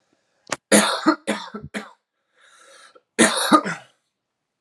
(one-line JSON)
{"cough_length": "4.6 s", "cough_amplitude": 32429, "cough_signal_mean_std_ratio": 0.36, "survey_phase": "alpha (2021-03-01 to 2021-08-12)", "age": "18-44", "gender": "Male", "wearing_mask": "No", "symptom_fatigue": true, "symptom_onset": "3 days", "smoker_status": "Never smoked", "respiratory_condition_asthma": false, "respiratory_condition_other": false, "recruitment_source": "Test and Trace", "submission_delay": "1 day", "covid_test_result": "Positive", "covid_test_method": "RT-qPCR", "covid_ct_value": 13.1, "covid_ct_gene": "N gene", "covid_ct_mean": 13.6, "covid_viral_load": "35000000 copies/ml", "covid_viral_load_category": "High viral load (>1M copies/ml)"}